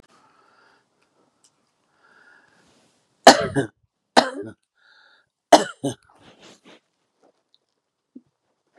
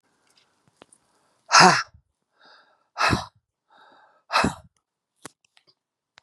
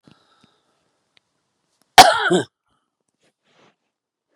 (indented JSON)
{
  "three_cough_length": "8.8 s",
  "three_cough_amplitude": 32768,
  "three_cough_signal_mean_std_ratio": 0.17,
  "exhalation_length": "6.2 s",
  "exhalation_amplitude": 31064,
  "exhalation_signal_mean_std_ratio": 0.25,
  "cough_length": "4.4 s",
  "cough_amplitude": 32768,
  "cough_signal_mean_std_ratio": 0.2,
  "survey_phase": "beta (2021-08-13 to 2022-03-07)",
  "age": "65+",
  "gender": "Female",
  "wearing_mask": "No",
  "symptom_none": true,
  "smoker_status": "Ex-smoker",
  "respiratory_condition_asthma": false,
  "respiratory_condition_other": false,
  "recruitment_source": "REACT",
  "submission_delay": "1 day",
  "covid_test_result": "Negative",
  "covid_test_method": "RT-qPCR",
  "influenza_a_test_result": "Negative",
  "influenza_b_test_result": "Negative"
}